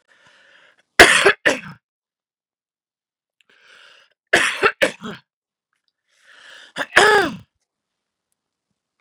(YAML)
three_cough_length: 9.0 s
three_cough_amplitude: 32768
three_cough_signal_mean_std_ratio: 0.27
survey_phase: beta (2021-08-13 to 2022-03-07)
age: 45-64
gender: Female
wearing_mask: 'No'
symptom_runny_or_blocked_nose: true
symptom_headache: true
symptom_onset: 9 days
smoker_status: Never smoked
respiratory_condition_asthma: false
respiratory_condition_other: false
recruitment_source: REACT
submission_delay: 2 days
covid_test_result: Positive
covid_test_method: RT-qPCR
covid_ct_value: 26.0
covid_ct_gene: E gene
influenza_a_test_result: Negative
influenza_b_test_result: Negative